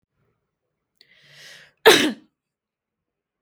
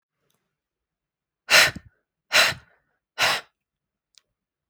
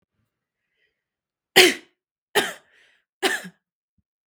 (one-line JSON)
{"cough_length": "3.4 s", "cough_amplitude": 32766, "cough_signal_mean_std_ratio": 0.21, "exhalation_length": "4.7 s", "exhalation_amplitude": 24688, "exhalation_signal_mean_std_ratio": 0.27, "three_cough_length": "4.3 s", "three_cough_amplitude": 32768, "three_cough_signal_mean_std_ratio": 0.23, "survey_phase": "beta (2021-08-13 to 2022-03-07)", "age": "18-44", "gender": "Female", "wearing_mask": "No", "symptom_none": true, "smoker_status": "Ex-smoker", "respiratory_condition_asthma": false, "respiratory_condition_other": false, "recruitment_source": "REACT", "submission_delay": "0 days", "covid_test_result": "Negative", "covid_test_method": "RT-qPCR", "influenza_a_test_result": "Negative", "influenza_b_test_result": "Negative"}